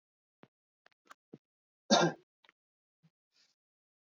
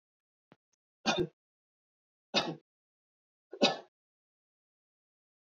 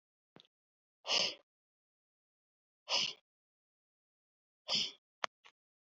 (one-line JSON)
{"cough_length": "4.2 s", "cough_amplitude": 7545, "cough_signal_mean_std_ratio": 0.18, "three_cough_length": "5.5 s", "three_cough_amplitude": 9816, "three_cough_signal_mean_std_ratio": 0.23, "exhalation_length": "6.0 s", "exhalation_amplitude": 6922, "exhalation_signal_mean_std_ratio": 0.26, "survey_phase": "beta (2021-08-13 to 2022-03-07)", "age": "18-44", "gender": "Male", "wearing_mask": "No", "symptom_none": true, "smoker_status": "Never smoked", "respiratory_condition_asthma": false, "respiratory_condition_other": false, "recruitment_source": "Test and Trace", "submission_delay": "0 days", "covid_test_result": "Negative", "covid_test_method": "LFT"}